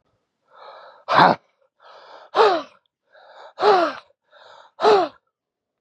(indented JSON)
{
  "exhalation_length": "5.8 s",
  "exhalation_amplitude": 32482,
  "exhalation_signal_mean_std_ratio": 0.36,
  "survey_phase": "beta (2021-08-13 to 2022-03-07)",
  "age": "45-64",
  "gender": "Male",
  "wearing_mask": "No",
  "symptom_cough_any": true,
  "symptom_runny_or_blocked_nose": true,
  "symptom_shortness_of_breath": true,
  "symptom_headache": true,
  "symptom_onset": "2 days",
  "smoker_status": "Current smoker (11 or more cigarettes per day)",
  "respiratory_condition_asthma": false,
  "respiratory_condition_other": false,
  "recruitment_source": "Test and Trace",
  "submission_delay": "1 day",
  "covid_test_result": "Negative",
  "covid_test_method": "RT-qPCR"
}